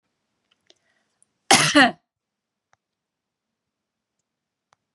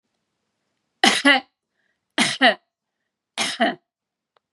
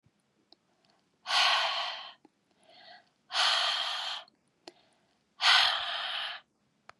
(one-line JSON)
{"cough_length": "4.9 s", "cough_amplitude": 32273, "cough_signal_mean_std_ratio": 0.21, "three_cough_length": "4.5 s", "three_cough_amplitude": 30878, "three_cough_signal_mean_std_ratio": 0.33, "exhalation_length": "7.0 s", "exhalation_amplitude": 10468, "exhalation_signal_mean_std_ratio": 0.47, "survey_phase": "beta (2021-08-13 to 2022-03-07)", "age": "45-64", "gender": "Female", "wearing_mask": "No", "symptom_none": true, "smoker_status": "Never smoked", "respiratory_condition_asthma": false, "respiratory_condition_other": false, "recruitment_source": "REACT", "submission_delay": "2 days", "covid_test_result": "Negative", "covid_test_method": "RT-qPCR", "influenza_a_test_result": "Negative", "influenza_b_test_result": "Negative"}